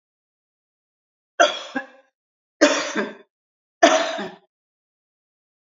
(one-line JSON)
{"three_cough_length": "5.7 s", "three_cough_amplitude": 30393, "three_cough_signal_mean_std_ratio": 0.3, "survey_phase": "beta (2021-08-13 to 2022-03-07)", "age": "65+", "gender": "Female", "wearing_mask": "No", "symptom_none": true, "smoker_status": "Never smoked", "respiratory_condition_asthma": false, "respiratory_condition_other": false, "recruitment_source": "REACT", "submission_delay": "1 day", "covid_test_result": "Negative", "covid_test_method": "RT-qPCR", "influenza_a_test_result": "Negative", "influenza_b_test_result": "Negative"}